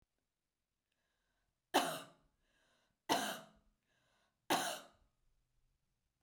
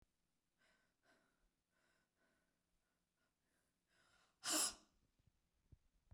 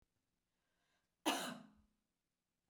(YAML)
three_cough_length: 6.2 s
three_cough_amplitude: 4146
three_cough_signal_mean_std_ratio: 0.27
exhalation_length: 6.1 s
exhalation_amplitude: 1345
exhalation_signal_mean_std_ratio: 0.19
cough_length: 2.7 s
cough_amplitude: 2646
cough_signal_mean_std_ratio: 0.26
survey_phase: beta (2021-08-13 to 2022-03-07)
age: 45-64
gender: Female
wearing_mask: 'No'
symptom_none: true
symptom_onset: 12 days
smoker_status: Never smoked
respiratory_condition_asthma: false
respiratory_condition_other: false
recruitment_source: REACT
submission_delay: 2 days
covid_test_result: Negative
covid_test_method: RT-qPCR
influenza_a_test_result: Negative
influenza_b_test_result: Negative